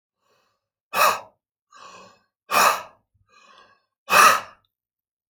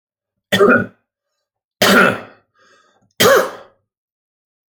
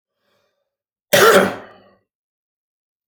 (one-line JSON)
{"exhalation_length": "5.3 s", "exhalation_amplitude": 26385, "exhalation_signal_mean_std_ratio": 0.31, "three_cough_length": "4.7 s", "three_cough_amplitude": 32043, "three_cough_signal_mean_std_ratio": 0.38, "cough_length": "3.1 s", "cough_amplitude": 30556, "cough_signal_mean_std_ratio": 0.29, "survey_phase": "alpha (2021-03-01 to 2021-08-12)", "age": "45-64", "gender": "Male", "wearing_mask": "No", "symptom_none": true, "smoker_status": "Ex-smoker", "respiratory_condition_asthma": true, "respiratory_condition_other": false, "recruitment_source": "REACT", "submission_delay": "2 days", "covid_test_result": "Negative", "covid_test_method": "RT-qPCR"}